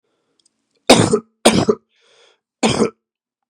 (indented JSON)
{
  "cough_length": "3.5 s",
  "cough_amplitude": 32768,
  "cough_signal_mean_std_ratio": 0.35,
  "survey_phase": "beta (2021-08-13 to 2022-03-07)",
  "age": "45-64",
  "gender": "Male",
  "wearing_mask": "No",
  "symptom_cough_any": true,
  "symptom_runny_or_blocked_nose": true,
  "symptom_abdominal_pain": true,
  "symptom_fatigue": true,
  "symptom_onset": "4 days",
  "smoker_status": "Ex-smoker",
  "respiratory_condition_asthma": false,
  "respiratory_condition_other": false,
  "recruitment_source": "Test and Trace",
  "submission_delay": "2 days",
  "covid_test_result": "Positive",
  "covid_test_method": "RT-qPCR",
  "covid_ct_value": 18.0,
  "covid_ct_gene": "ORF1ab gene",
  "covid_ct_mean": 18.4,
  "covid_viral_load": "920000 copies/ml",
  "covid_viral_load_category": "Low viral load (10K-1M copies/ml)"
}